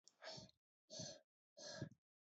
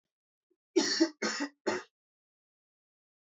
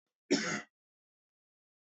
{"exhalation_length": "2.3 s", "exhalation_amplitude": 530, "exhalation_signal_mean_std_ratio": 0.5, "three_cough_length": "3.2 s", "three_cough_amplitude": 6688, "three_cough_signal_mean_std_ratio": 0.35, "cough_length": "1.9 s", "cough_amplitude": 4957, "cough_signal_mean_std_ratio": 0.29, "survey_phase": "beta (2021-08-13 to 2022-03-07)", "age": "18-44", "gender": "Male", "wearing_mask": "No", "symptom_cough_any": true, "symptom_new_continuous_cough": true, "symptom_runny_or_blocked_nose": true, "symptom_sore_throat": true, "symptom_fatigue": true, "symptom_onset": "3 days", "smoker_status": "Never smoked", "respiratory_condition_asthma": false, "respiratory_condition_other": false, "recruitment_source": "Test and Trace", "submission_delay": "1 day", "covid_test_result": "Negative", "covid_test_method": "RT-qPCR"}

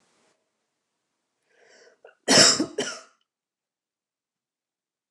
{"cough_length": "5.1 s", "cough_amplitude": 25072, "cough_signal_mean_std_ratio": 0.23, "survey_phase": "beta (2021-08-13 to 2022-03-07)", "age": "45-64", "gender": "Female", "wearing_mask": "No", "symptom_none": true, "smoker_status": "Ex-smoker", "respiratory_condition_asthma": false, "respiratory_condition_other": false, "recruitment_source": "REACT", "submission_delay": "5 days", "covid_test_result": "Negative", "covid_test_method": "RT-qPCR", "influenza_a_test_result": "Negative", "influenza_b_test_result": "Negative"}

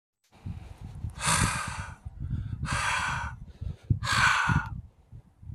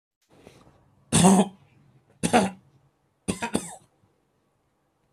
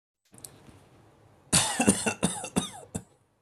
{"exhalation_length": "5.5 s", "exhalation_amplitude": 9106, "exhalation_signal_mean_std_ratio": 0.64, "three_cough_length": "5.1 s", "three_cough_amplitude": 22495, "three_cough_signal_mean_std_ratio": 0.3, "cough_length": "3.4 s", "cough_amplitude": 15675, "cough_signal_mean_std_ratio": 0.4, "survey_phase": "alpha (2021-03-01 to 2021-08-12)", "age": "18-44", "gender": "Male", "wearing_mask": "No", "symptom_none": true, "smoker_status": "Never smoked", "respiratory_condition_asthma": false, "respiratory_condition_other": false, "recruitment_source": "REACT", "submission_delay": "2 days", "covid_test_result": "Negative", "covid_test_method": "RT-qPCR"}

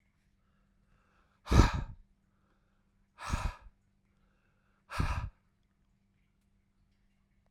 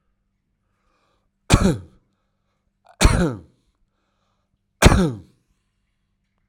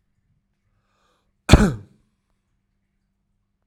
{"exhalation_length": "7.5 s", "exhalation_amplitude": 14102, "exhalation_signal_mean_std_ratio": 0.24, "three_cough_length": "6.5 s", "three_cough_amplitude": 32768, "three_cough_signal_mean_std_ratio": 0.27, "cough_length": "3.7 s", "cough_amplitude": 32768, "cough_signal_mean_std_ratio": 0.17, "survey_phase": "alpha (2021-03-01 to 2021-08-12)", "age": "45-64", "gender": "Male", "wearing_mask": "No", "symptom_none": true, "symptom_onset": "10 days", "smoker_status": "Ex-smoker", "respiratory_condition_asthma": true, "respiratory_condition_other": false, "recruitment_source": "REACT", "submission_delay": "1 day", "covid_test_result": "Negative", "covid_test_method": "RT-qPCR"}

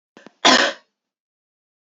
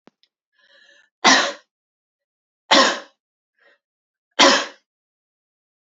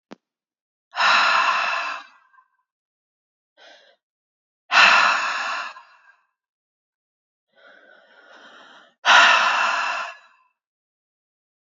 {"cough_length": "1.9 s", "cough_amplitude": 31087, "cough_signal_mean_std_ratio": 0.29, "three_cough_length": "5.9 s", "three_cough_amplitude": 32768, "three_cough_signal_mean_std_ratio": 0.28, "exhalation_length": "11.6 s", "exhalation_amplitude": 28334, "exhalation_signal_mean_std_ratio": 0.38, "survey_phase": "beta (2021-08-13 to 2022-03-07)", "age": "18-44", "gender": "Female", "wearing_mask": "No", "symptom_cough_any": true, "symptom_runny_or_blocked_nose": true, "symptom_shortness_of_breath": true, "symptom_sore_throat": true, "symptom_fatigue": true, "symptom_headache": true, "smoker_status": "Never smoked", "respiratory_condition_asthma": false, "respiratory_condition_other": false, "recruitment_source": "Test and Trace", "submission_delay": "1 day", "covid_test_result": "Positive", "covid_test_method": "RT-qPCR", "covid_ct_value": 26.0, "covid_ct_gene": "N gene"}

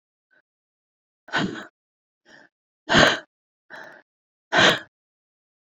{"exhalation_length": "5.7 s", "exhalation_amplitude": 28422, "exhalation_signal_mean_std_ratio": 0.28, "survey_phase": "beta (2021-08-13 to 2022-03-07)", "age": "18-44", "gender": "Female", "wearing_mask": "No", "symptom_cough_any": true, "symptom_runny_or_blocked_nose": true, "symptom_shortness_of_breath": true, "symptom_fatigue": true, "symptom_fever_high_temperature": true, "symptom_headache": true, "symptom_change_to_sense_of_smell_or_taste": true, "symptom_loss_of_taste": true, "symptom_other": true, "symptom_onset": "3 days", "smoker_status": "Never smoked", "respiratory_condition_asthma": true, "respiratory_condition_other": false, "recruitment_source": "Test and Trace", "submission_delay": "2 days", "covid_test_result": "Positive", "covid_test_method": "RT-qPCR", "covid_ct_value": 11.1, "covid_ct_gene": "ORF1ab gene", "covid_ct_mean": 11.7, "covid_viral_load": "150000000 copies/ml", "covid_viral_load_category": "High viral load (>1M copies/ml)"}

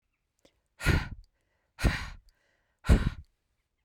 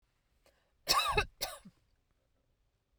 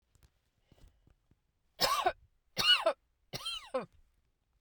{"exhalation_length": "3.8 s", "exhalation_amplitude": 14076, "exhalation_signal_mean_std_ratio": 0.31, "cough_length": "3.0 s", "cough_amplitude": 7790, "cough_signal_mean_std_ratio": 0.32, "three_cough_length": "4.6 s", "three_cough_amplitude": 5927, "three_cough_signal_mean_std_ratio": 0.34, "survey_phase": "beta (2021-08-13 to 2022-03-07)", "age": "18-44", "gender": "Female", "wearing_mask": "No", "symptom_none": true, "smoker_status": "Never smoked", "respiratory_condition_asthma": false, "respiratory_condition_other": false, "recruitment_source": "REACT", "submission_delay": "0 days", "covid_test_result": "Negative", "covid_test_method": "RT-qPCR"}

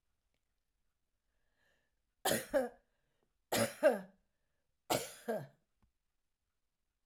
{"three_cough_length": "7.1 s", "three_cough_amplitude": 4396, "three_cough_signal_mean_std_ratio": 0.29, "survey_phase": "alpha (2021-03-01 to 2021-08-12)", "age": "65+", "gender": "Female", "wearing_mask": "No", "symptom_none": true, "smoker_status": "Never smoked", "respiratory_condition_asthma": false, "respiratory_condition_other": false, "recruitment_source": "REACT", "submission_delay": "1 day", "covid_test_result": "Negative", "covid_test_method": "RT-qPCR"}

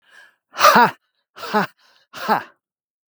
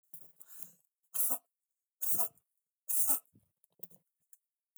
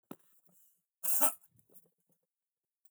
{"exhalation_length": "3.1 s", "exhalation_amplitude": 32768, "exhalation_signal_mean_std_ratio": 0.34, "three_cough_length": "4.8 s", "three_cough_amplitude": 7031, "three_cough_signal_mean_std_ratio": 0.34, "cough_length": "2.9 s", "cough_amplitude": 8798, "cough_signal_mean_std_ratio": 0.25, "survey_phase": "beta (2021-08-13 to 2022-03-07)", "age": "45-64", "gender": "Male", "wearing_mask": "No", "symptom_none": true, "smoker_status": "Never smoked", "respiratory_condition_asthma": false, "respiratory_condition_other": false, "recruitment_source": "REACT", "submission_delay": "1 day", "covid_test_result": "Negative", "covid_test_method": "RT-qPCR", "influenza_a_test_result": "Negative", "influenza_b_test_result": "Negative"}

